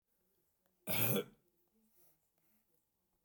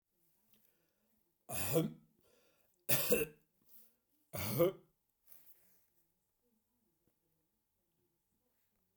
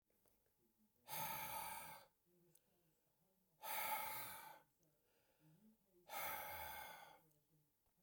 {"cough_length": "3.2 s", "cough_amplitude": 3008, "cough_signal_mean_std_ratio": 0.28, "three_cough_length": "9.0 s", "three_cough_amplitude": 5031, "three_cough_signal_mean_std_ratio": 0.28, "exhalation_length": "8.0 s", "exhalation_amplitude": 865, "exhalation_signal_mean_std_ratio": 0.52, "survey_phase": "beta (2021-08-13 to 2022-03-07)", "age": "65+", "gender": "Male", "wearing_mask": "No", "symptom_none": true, "smoker_status": "Never smoked", "respiratory_condition_asthma": false, "respiratory_condition_other": false, "recruitment_source": "REACT", "submission_delay": "2 days", "covid_test_result": "Negative", "covid_test_method": "RT-qPCR"}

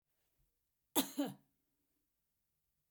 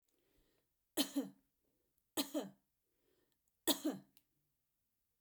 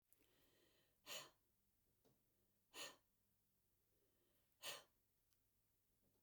{"cough_length": "2.9 s", "cough_amplitude": 4285, "cough_signal_mean_std_ratio": 0.22, "three_cough_length": "5.2 s", "three_cough_amplitude": 4038, "three_cough_signal_mean_std_ratio": 0.27, "exhalation_length": "6.2 s", "exhalation_amplitude": 369, "exhalation_signal_mean_std_ratio": 0.32, "survey_phase": "beta (2021-08-13 to 2022-03-07)", "age": "45-64", "gender": "Female", "wearing_mask": "No", "symptom_none": true, "smoker_status": "Never smoked", "respiratory_condition_asthma": false, "respiratory_condition_other": false, "recruitment_source": "REACT", "submission_delay": "2 days", "covid_test_result": "Negative", "covid_test_method": "RT-qPCR", "influenza_a_test_result": "Negative", "influenza_b_test_result": "Negative"}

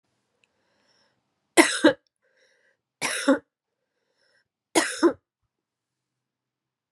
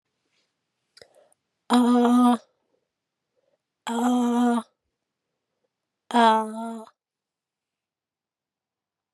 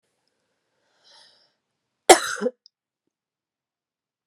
{"three_cough_length": "6.9 s", "three_cough_amplitude": 30869, "three_cough_signal_mean_std_ratio": 0.24, "exhalation_length": "9.1 s", "exhalation_amplitude": 17980, "exhalation_signal_mean_std_ratio": 0.39, "cough_length": "4.3 s", "cough_amplitude": 32768, "cough_signal_mean_std_ratio": 0.15, "survey_phase": "beta (2021-08-13 to 2022-03-07)", "age": "45-64", "gender": "Female", "wearing_mask": "No", "symptom_cough_any": true, "symptom_runny_or_blocked_nose": true, "symptom_fatigue": true, "symptom_change_to_sense_of_smell_or_taste": true, "symptom_onset": "7 days", "smoker_status": "Never smoked", "respiratory_condition_asthma": false, "respiratory_condition_other": false, "recruitment_source": "Test and Trace", "submission_delay": "2 days", "covid_test_result": "Positive", "covid_test_method": "RT-qPCR"}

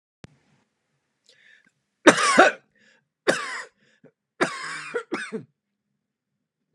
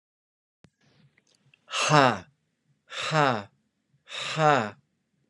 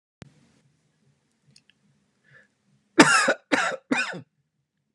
{"three_cough_length": "6.7 s", "three_cough_amplitude": 32244, "three_cough_signal_mean_std_ratio": 0.27, "exhalation_length": "5.3 s", "exhalation_amplitude": 23238, "exhalation_signal_mean_std_ratio": 0.34, "cough_length": "4.9 s", "cough_amplitude": 32202, "cough_signal_mean_std_ratio": 0.28, "survey_phase": "beta (2021-08-13 to 2022-03-07)", "age": "45-64", "gender": "Male", "wearing_mask": "No", "symptom_none": true, "symptom_onset": "8 days", "smoker_status": "Ex-smoker", "respiratory_condition_asthma": false, "respiratory_condition_other": false, "recruitment_source": "REACT", "submission_delay": "1 day", "covid_test_result": "Negative", "covid_test_method": "RT-qPCR", "influenza_a_test_result": "Negative", "influenza_b_test_result": "Negative"}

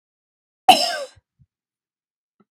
{"cough_length": "2.5 s", "cough_amplitude": 32768, "cough_signal_mean_std_ratio": 0.22, "survey_phase": "beta (2021-08-13 to 2022-03-07)", "age": "18-44", "gender": "Female", "wearing_mask": "No", "symptom_none": true, "smoker_status": "Never smoked", "respiratory_condition_asthma": false, "respiratory_condition_other": false, "recruitment_source": "REACT", "submission_delay": "1 day", "covid_test_result": "Negative", "covid_test_method": "RT-qPCR", "influenza_a_test_result": "Negative", "influenza_b_test_result": "Negative"}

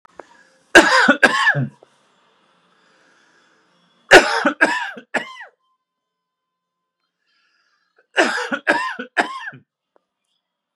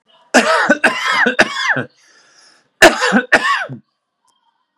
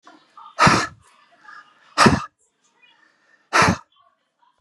{"three_cough_length": "10.8 s", "three_cough_amplitude": 32768, "three_cough_signal_mean_std_ratio": 0.32, "cough_length": "4.8 s", "cough_amplitude": 32768, "cough_signal_mean_std_ratio": 0.5, "exhalation_length": "4.6 s", "exhalation_amplitude": 32250, "exhalation_signal_mean_std_ratio": 0.32, "survey_phase": "beta (2021-08-13 to 2022-03-07)", "age": "45-64", "gender": "Male", "wearing_mask": "No", "symptom_none": true, "smoker_status": "Ex-smoker", "respiratory_condition_asthma": false, "respiratory_condition_other": false, "recruitment_source": "REACT", "submission_delay": "1 day", "covid_test_result": "Negative", "covid_test_method": "RT-qPCR", "influenza_a_test_result": "Unknown/Void", "influenza_b_test_result": "Unknown/Void"}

